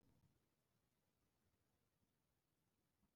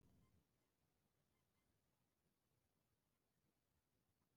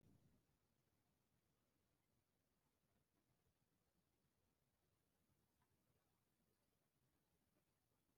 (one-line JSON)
{"exhalation_length": "3.2 s", "exhalation_amplitude": 16, "exhalation_signal_mean_std_ratio": 0.77, "cough_length": "4.4 s", "cough_amplitude": 17, "cough_signal_mean_std_ratio": 0.71, "three_cough_length": "8.2 s", "three_cough_amplitude": 22, "three_cough_signal_mean_std_ratio": 0.76, "survey_phase": "beta (2021-08-13 to 2022-03-07)", "age": "18-44", "gender": "Female", "wearing_mask": "No", "symptom_cough_any": true, "symptom_shortness_of_breath": true, "symptom_sore_throat": true, "symptom_fever_high_temperature": true, "symptom_headache": true, "symptom_onset": "7 days", "smoker_status": "Ex-smoker", "respiratory_condition_asthma": false, "respiratory_condition_other": false, "recruitment_source": "REACT", "submission_delay": "1 day", "covid_test_result": "Negative", "covid_test_method": "RT-qPCR", "influenza_a_test_result": "Unknown/Void", "influenza_b_test_result": "Unknown/Void"}